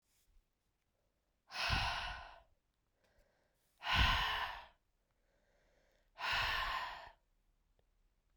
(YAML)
exhalation_length: 8.4 s
exhalation_amplitude: 3551
exhalation_signal_mean_std_ratio: 0.41
survey_phase: beta (2021-08-13 to 2022-03-07)
age: 18-44
gender: Female
wearing_mask: 'No'
symptom_cough_any: true
symptom_new_continuous_cough: true
symptom_runny_or_blocked_nose: true
symptom_fatigue: true
symptom_headache: true
symptom_change_to_sense_of_smell_or_taste: true
symptom_other: true
symptom_onset: 4 days
smoker_status: Never smoked
respiratory_condition_asthma: false
respiratory_condition_other: false
recruitment_source: Test and Trace
submission_delay: 2 days
covid_test_result: Positive
covid_test_method: RT-qPCR
covid_ct_value: 20.0
covid_ct_gene: ORF1ab gene